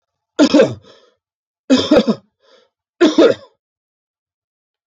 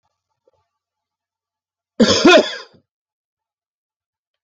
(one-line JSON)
{"three_cough_length": "4.9 s", "three_cough_amplitude": 31112, "three_cough_signal_mean_std_ratio": 0.36, "cough_length": "4.4 s", "cough_amplitude": 30749, "cough_signal_mean_std_ratio": 0.26, "survey_phase": "beta (2021-08-13 to 2022-03-07)", "age": "65+", "gender": "Male", "wearing_mask": "No", "symptom_none": true, "smoker_status": "Never smoked", "respiratory_condition_asthma": false, "respiratory_condition_other": false, "recruitment_source": "REACT", "submission_delay": "2 days", "covid_test_result": "Negative", "covid_test_method": "RT-qPCR"}